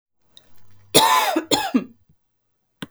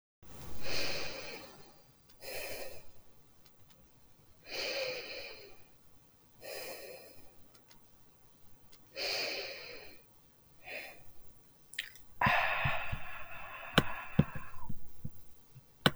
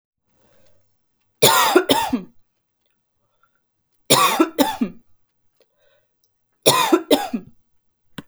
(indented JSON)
{
  "cough_length": "2.9 s",
  "cough_amplitude": 32766,
  "cough_signal_mean_std_ratio": 0.42,
  "exhalation_length": "16.0 s",
  "exhalation_amplitude": 15407,
  "exhalation_signal_mean_std_ratio": 0.57,
  "three_cough_length": "8.3 s",
  "three_cough_amplitude": 32768,
  "three_cough_signal_mean_std_ratio": 0.37,
  "survey_phase": "beta (2021-08-13 to 2022-03-07)",
  "age": "18-44",
  "gender": "Female",
  "wearing_mask": "No",
  "symptom_none": true,
  "smoker_status": "Never smoked",
  "respiratory_condition_asthma": false,
  "respiratory_condition_other": false,
  "recruitment_source": "REACT",
  "submission_delay": "1 day",
  "covid_test_result": "Negative",
  "covid_test_method": "RT-qPCR",
  "influenza_a_test_result": "Negative",
  "influenza_b_test_result": "Negative"
}